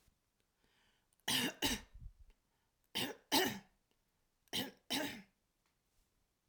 {"three_cough_length": "6.5 s", "three_cough_amplitude": 3491, "three_cough_signal_mean_std_ratio": 0.36, "survey_phase": "alpha (2021-03-01 to 2021-08-12)", "age": "45-64", "gender": "Female", "wearing_mask": "No", "symptom_none": true, "smoker_status": "Ex-smoker", "respiratory_condition_asthma": false, "respiratory_condition_other": false, "recruitment_source": "REACT", "submission_delay": "2 days", "covid_test_result": "Negative", "covid_test_method": "RT-qPCR"}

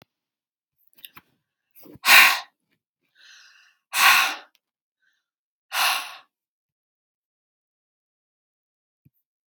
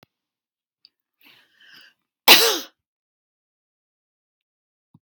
{"exhalation_length": "9.5 s", "exhalation_amplitude": 32479, "exhalation_signal_mean_std_ratio": 0.24, "cough_length": "5.0 s", "cough_amplitude": 32768, "cough_signal_mean_std_ratio": 0.18, "survey_phase": "beta (2021-08-13 to 2022-03-07)", "age": "45-64", "gender": "Female", "wearing_mask": "No", "symptom_none": true, "smoker_status": "Never smoked", "respiratory_condition_asthma": false, "respiratory_condition_other": false, "recruitment_source": "REACT", "submission_delay": "1 day", "covid_test_result": "Negative", "covid_test_method": "RT-qPCR"}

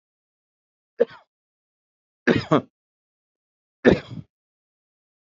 {"three_cough_length": "5.3 s", "three_cough_amplitude": 26489, "three_cough_signal_mean_std_ratio": 0.2, "survey_phase": "beta (2021-08-13 to 2022-03-07)", "age": "65+", "gender": "Male", "wearing_mask": "No", "symptom_none": true, "smoker_status": "Never smoked", "respiratory_condition_asthma": false, "respiratory_condition_other": false, "recruitment_source": "REACT", "submission_delay": "1 day", "covid_test_result": "Negative", "covid_test_method": "RT-qPCR", "influenza_a_test_result": "Negative", "influenza_b_test_result": "Negative"}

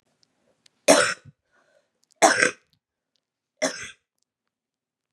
{"three_cough_length": "5.1 s", "three_cough_amplitude": 29120, "three_cough_signal_mean_std_ratio": 0.26, "survey_phase": "beta (2021-08-13 to 2022-03-07)", "age": "18-44", "gender": "Female", "wearing_mask": "No", "symptom_runny_or_blocked_nose": true, "symptom_sore_throat": true, "symptom_diarrhoea": true, "symptom_fatigue": true, "symptom_fever_high_temperature": true, "symptom_headache": true, "symptom_other": true, "symptom_onset": "3 days", "smoker_status": "Ex-smoker", "respiratory_condition_asthma": false, "respiratory_condition_other": false, "recruitment_source": "Test and Trace", "submission_delay": "2 days", "covid_test_result": "Positive", "covid_test_method": "RT-qPCR", "covid_ct_value": 22.5, "covid_ct_gene": "ORF1ab gene"}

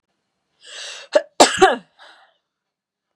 {"cough_length": "3.2 s", "cough_amplitude": 32768, "cough_signal_mean_std_ratio": 0.27, "survey_phase": "beta (2021-08-13 to 2022-03-07)", "age": "45-64", "gender": "Female", "wearing_mask": "No", "symptom_runny_or_blocked_nose": true, "symptom_diarrhoea": true, "symptom_onset": "8 days", "smoker_status": "Never smoked", "respiratory_condition_asthma": false, "respiratory_condition_other": false, "recruitment_source": "Test and Trace", "submission_delay": "1 day", "covid_test_result": "Positive", "covid_test_method": "RT-qPCR", "covid_ct_value": 27.9, "covid_ct_gene": "ORF1ab gene"}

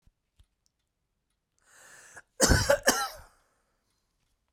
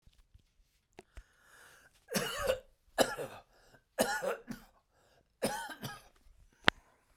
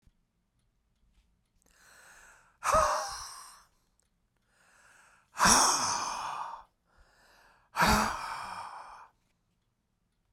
{"cough_length": "4.5 s", "cough_amplitude": 16912, "cough_signal_mean_std_ratio": 0.28, "three_cough_length": "7.2 s", "three_cough_amplitude": 26425, "three_cough_signal_mean_std_ratio": 0.33, "exhalation_length": "10.3 s", "exhalation_amplitude": 14159, "exhalation_signal_mean_std_ratio": 0.37, "survey_phase": "beta (2021-08-13 to 2022-03-07)", "age": "45-64", "gender": "Male", "wearing_mask": "No", "symptom_none": true, "smoker_status": "Never smoked", "recruitment_source": "REACT", "submission_delay": "1 day", "covid_test_result": "Negative", "covid_test_method": "RT-qPCR"}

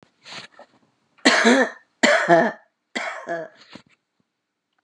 {"three_cough_length": "4.8 s", "three_cough_amplitude": 30814, "three_cough_signal_mean_std_ratio": 0.39, "survey_phase": "beta (2021-08-13 to 2022-03-07)", "age": "45-64", "gender": "Female", "wearing_mask": "No", "symptom_none": true, "smoker_status": "Ex-smoker", "respiratory_condition_asthma": false, "respiratory_condition_other": false, "recruitment_source": "REACT", "submission_delay": "1 day", "covid_test_result": "Negative", "covid_test_method": "RT-qPCR", "influenza_a_test_result": "Negative", "influenza_b_test_result": "Negative"}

